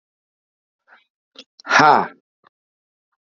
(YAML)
exhalation_length: 3.2 s
exhalation_amplitude: 32767
exhalation_signal_mean_std_ratio: 0.25
survey_phase: beta (2021-08-13 to 2022-03-07)
age: 45-64
gender: Male
wearing_mask: 'No'
symptom_cough_any: true
symptom_runny_or_blocked_nose: true
symptom_shortness_of_breath: true
symptom_diarrhoea: true
symptom_headache: true
symptom_change_to_sense_of_smell_or_taste: true
smoker_status: Never smoked
respiratory_condition_asthma: false
respiratory_condition_other: false
recruitment_source: Test and Trace
submission_delay: 1 day
covid_test_result: Positive
covid_test_method: RT-qPCR